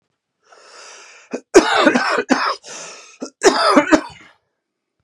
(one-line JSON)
{"cough_length": "5.0 s", "cough_amplitude": 32768, "cough_signal_mean_std_ratio": 0.43, "survey_phase": "beta (2021-08-13 to 2022-03-07)", "age": "18-44", "gender": "Male", "wearing_mask": "No", "symptom_cough_any": true, "symptom_runny_or_blocked_nose": true, "symptom_fatigue": true, "symptom_headache": true, "symptom_other": true, "symptom_onset": "3 days", "smoker_status": "Never smoked", "respiratory_condition_asthma": true, "respiratory_condition_other": false, "recruitment_source": "Test and Trace", "submission_delay": "2 days", "covid_test_result": "Positive", "covid_test_method": "ePCR"}